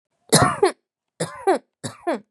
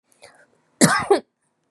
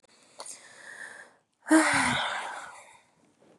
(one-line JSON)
{"three_cough_length": "2.3 s", "three_cough_amplitude": 31171, "three_cough_signal_mean_std_ratio": 0.41, "cough_length": "1.7 s", "cough_amplitude": 32767, "cough_signal_mean_std_ratio": 0.33, "exhalation_length": "3.6 s", "exhalation_amplitude": 11807, "exhalation_signal_mean_std_ratio": 0.41, "survey_phase": "beta (2021-08-13 to 2022-03-07)", "age": "18-44", "gender": "Female", "wearing_mask": "No", "symptom_other": true, "symptom_onset": "5 days", "smoker_status": "Current smoker (1 to 10 cigarettes per day)", "respiratory_condition_asthma": false, "respiratory_condition_other": false, "recruitment_source": "Test and Trace", "submission_delay": "2 days", "covid_test_result": "Positive", "covid_test_method": "ePCR"}